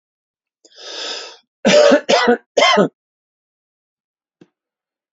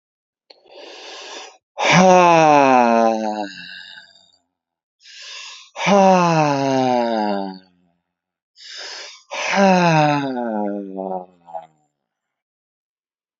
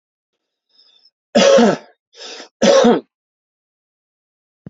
{"three_cough_length": "5.1 s", "three_cough_amplitude": 29876, "three_cough_signal_mean_std_ratio": 0.38, "exhalation_length": "13.4 s", "exhalation_amplitude": 32027, "exhalation_signal_mean_std_ratio": 0.49, "cough_length": "4.7 s", "cough_amplitude": 29330, "cough_signal_mean_std_ratio": 0.36, "survey_phase": "alpha (2021-03-01 to 2021-08-12)", "age": "45-64", "gender": "Male", "wearing_mask": "No", "symptom_none": true, "smoker_status": "Never smoked", "respiratory_condition_asthma": false, "respiratory_condition_other": false, "recruitment_source": "Test and Trace", "submission_delay": "1 day", "covid_test_result": "Negative", "covid_test_method": "LFT"}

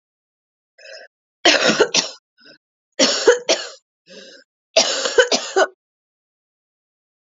{"three_cough_length": "7.3 s", "three_cough_amplitude": 32768, "three_cough_signal_mean_std_ratio": 0.37, "survey_phase": "alpha (2021-03-01 to 2021-08-12)", "age": "18-44", "gender": "Female", "wearing_mask": "No", "symptom_cough_any": true, "symptom_new_continuous_cough": true, "symptom_shortness_of_breath": true, "symptom_fatigue": true, "symptom_change_to_sense_of_smell_or_taste": true, "symptom_onset": "6 days", "smoker_status": "Ex-smoker", "respiratory_condition_asthma": false, "respiratory_condition_other": false, "recruitment_source": "Test and Trace", "submission_delay": "2 days", "covid_test_result": "Positive", "covid_test_method": "RT-qPCR", "covid_ct_value": 14.7, "covid_ct_gene": "ORF1ab gene", "covid_ct_mean": 15.0, "covid_viral_load": "12000000 copies/ml", "covid_viral_load_category": "High viral load (>1M copies/ml)"}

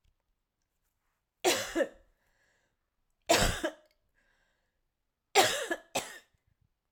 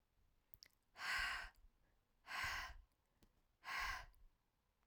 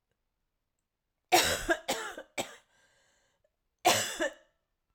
{"three_cough_length": "6.9 s", "three_cough_amplitude": 12179, "three_cough_signal_mean_std_ratio": 0.31, "exhalation_length": "4.9 s", "exhalation_amplitude": 830, "exhalation_signal_mean_std_ratio": 0.47, "cough_length": "4.9 s", "cough_amplitude": 10752, "cough_signal_mean_std_ratio": 0.34, "survey_phase": "alpha (2021-03-01 to 2021-08-12)", "age": "45-64", "gender": "Female", "wearing_mask": "No", "symptom_cough_any": true, "symptom_fatigue": true, "symptom_headache": true, "symptom_onset": "5 days", "smoker_status": "Never smoked", "respiratory_condition_asthma": false, "respiratory_condition_other": false, "recruitment_source": "Test and Trace", "submission_delay": "2 days", "covid_test_result": "Positive", "covid_test_method": "RT-qPCR", "covid_ct_value": 31.6, "covid_ct_gene": "S gene", "covid_ct_mean": 32.2, "covid_viral_load": "28 copies/ml", "covid_viral_load_category": "Minimal viral load (< 10K copies/ml)"}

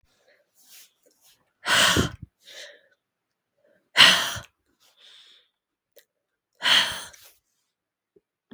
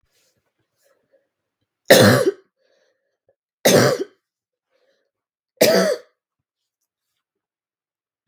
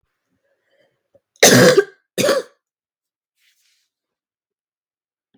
{"exhalation_length": "8.5 s", "exhalation_amplitude": 32768, "exhalation_signal_mean_std_ratio": 0.28, "three_cough_length": "8.3 s", "three_cough_amplitude": 32766, "three_cough_signal_mean_std_ratio": 0.28, "cough_length": "5.4 s", "cough_amplitude": 32768, "cough_signal_mean_std_ratio": 0.27, "survey_phase": "beta (2021-08-13 to 2022-03-07)", "age": "18-44", "gender": "Female", "wearing_mask": "No", "symptom_runny_or_blocked_nose": true, "symptom_shortness_of_breath": true, "symptom_sore_throat": true, "symptom_fatigue": true, "symptom_headache": true, "smoker_status": "Ex-smoker", "respiratory_condition_asthma": false, "respiratory_condition_other": false, "recruitment_source": "Test and Trace", "submission_delay": "0 days", "covid_test_result": "Positive", "covid_test_method": "RT-qPCR", "covid_ct_value": 20.2, "covid_ct_gene": "ORF1ab gene", "covid_ct_mean": 20.4, "covid_viral_load": "210000 copies/ml", "covid_viral_load_category": "Low viral load (10K-1M copies/ml)"}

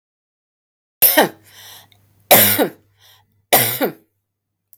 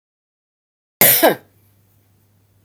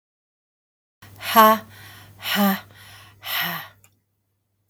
{"three_cough_length": "4.8 s", "three_cough_amplitude": 32768, "three_cough_signal_mean_std_ratio": 0.35, "cough_length": "2.6 s", "cough_amplitude": 32768, "cough_signal_mean_std_ratio": 0.28, "exhalation_length": "4.7 s", "exhalation_amplitude": 32480, "exhalation_signal_mean_std_ratio": 0.34, "survey_phase": "beta (2021-08-13 to 2022-03-07)", "age": "45-64", "gender": "Female", "wearing_mask": "No", "symptom_none": true, "smoker_status": "Never smoked", "respiratory_condition_asthma": false, "respiratory_condition_other": false, "recruitment_source": "REACT", "submission_delay": "3 days", "covid_test_result": "Negative", "covid_test_method": "RT-qPCR", "influenza_a_test_result": "Negative", "influenza_b_test_result": "Negative"}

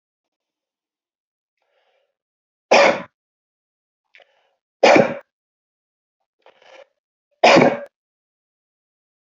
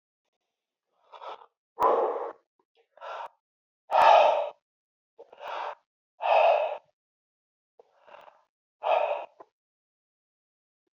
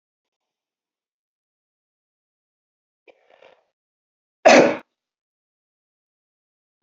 {"three_cough_length": "9.4 s", "three_cough_amplitude": 29717, "three_cough_signal_mean_std_ratio": 0.24, "exhalation_length": "10.9 s", "exhalation_amplitude": 14254, "exhalation_signal_mean_std_ratio": 0.35, "cough_length": "6.8 s", "cough_amplitude": 28821, "cough_signal_mean_std_ratio": 0.16, "survey_phase": "beta (2021-08-13 to 2022-03-07)", "age": "45-64", "gender": "Male", "wearing_mask": "No", "symptom_none": true, "smoker_status": "Never smoked", "respiratory_condition_asthma": false, "respiratory_condition_other": false, "recruitment_source": "Test and Trace", "submission_delay": "3 days", "covid_test_result": "Negative", "covid_test_method": "RT-qPCR"}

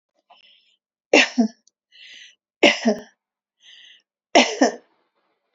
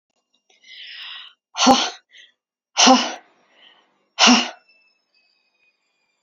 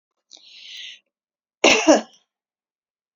{"three_cough_length": "5.5 s", "three_cough_amplitude": 32767, "three_cough_signal_mean_std_ratio": 0.29, "exhalation_length": "6.2 s", "exhalation_amplitude": 32140, "exhalation_signal_mean_std_ratio": 0.31, "cough_length": "3.2 s", "cough_amplitude": 30175, "cough_signal_mean_std_ratio": 0.27, "survey_phase": "beta (2021-08-13 to 2022-03-07)", "age": "65+", "gender": "Female", "wearing_mask": "No", "symptom_none": true, "smoker_status": "Ex-smoker", "respiratory_condition_asthma": false, "respiratory_condition_other": false, "recruitment_source": "REACT", "submission_delay": "1 day", "covid_test_result": "Negative", "covid_test_method": "RT-qPCR"}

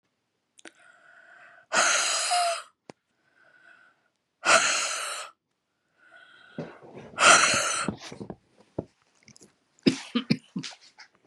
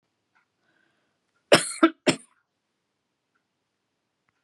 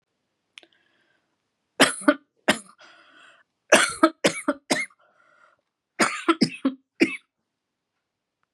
{"exhalation_length": "11.3 s", "exhalation_amplitude": 24527, "exhalation_signal_mean_std_ratio": 0.38, "cough_length": "4.4 s", "cough_amplitude": 25865, "cough_signal_mean_std_ratio": 0.18, "three_cough_length": "8.5 s", "three_cough_amplitude": 31196, "three_cough_signal_mean_std_ratio": 0.29, "survey_phase": "beta (2021-08-13 to 2022-03-07)", "age": "45-64", "gender": "Female", "wearing_mask": "No", "symptom_new_continuous_cough": true, "symptom_sore_throat": true, "symptom_headache": true, "symptom_other": true, "symptom_onset": "1 day", "smoker_status": "Never smoked", "respiratory_condition_asthma": false, "respiratory_condition_other": false, "recruitment_source": "Test and Trace", "submission_delay": "0 days", "covid_test_result": "Positive", "covid_test_method": "ePCR"}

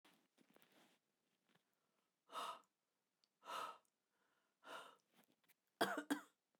{"exhalation_length": "6.6 s", "exhalation_amplitude": 1979, "exhalation_signal_mean_std_ratio": 0.28, "survey_phase": "beta (2021-08-13 to 2022-03-07)", "age": "45-64", "gender": "Female", "wearing_mask": "No", "symptom_cough_any": true, "symptom_new_continuous_cough": true, "symptom_onset": "12 days", "smoker_status": "Never smoked", "respiratory_condition_asthma": false, "respiratory_condition_other": false, "recruitment_source": "REACT", "submission_delay": "2 days", "covid_test_result": "Negative", "covid_test_method": "RT-qPCR"}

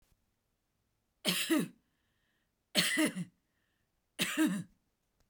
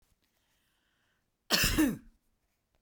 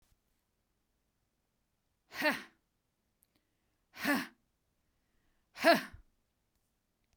{"three_cough_length": "5.3 s", "three_cough_amplitude": 7217, "three_cough_signal_mean_std_ratio": 0.4, "cough_length": "2.8 s", "cough_amplitude": 8039, "cough_signal_mean_std_ratio": 0.33, "exhalation_length": "7.2 s", "exhalation_amplitude": 8884, "exhalation_signal_mean_std_ratio": 0.22, "survey_phase": "beta (2021-08-13 to 2022-03-07)", "age": "45-64", "gender": "Female", "wearing_mask": "No", "symptom_none": true, "smoker_status": "Never smoked", "respiratory_condition_asthma": false, "respiratory_condition_other": false, "recruitment_source": "REACT", "submission_delay": "1 day", "covid_test_result": "Negative", "covid_test_method": "RT-qPCR"}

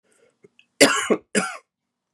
{"cough_length": "2.1 s", "cough_amplitude": 32768, "cough_signal_mean_std_ratio": 0.33, "survey_phase": "beta (2021-08-13 to 2022-03-07)", "age": "45-64", "wearing_mask": "No", "symptom_cough_any": true, "symptom_runny_or_blocked_nose": true, "symptom_sore_throat": true, "symptom_fatigue": true, "symptom_headache": true, "symptom_onset": "3 days", "smoker_status": "Never smoked", "respiratory_condition_asthma": false, "respiratory_condition_other": false, "recruitment_source": "Test and Trace", "submission_delay": "3 days", "covid_test_result": "Positive", "covid_test_method": "RT-qPCR", "covid_ct_value": 28.1, "covid_ct_gene": "N gene"}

